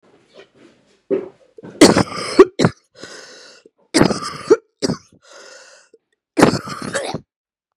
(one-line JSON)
{"cough_length": "7.8 s", "cough_amplitude": 32768, "cough_signal_mean_std_ratio": 0.32, "survey_phase": "beta (2021-08-13 to 2022-03-07)", "age": "18-44", "gender": "Female", "wearing_mask": "No", "symptom_cough_any": true, "symptom_runny_or_blocked_nose": true, "symptom_sore_throat": true, "symptom_fatigue": true, "symptom_headache": true, "symptom_other": true, "smoker_status": "Ex-smoker", "respiratory_condition_asthma": false, "respiratory_condition_other": false, "recruitment_source": "Test and Trace", "submission_delay": "4 days", "covid_test_result": "Positive", "covid_test_method": "LAMP"}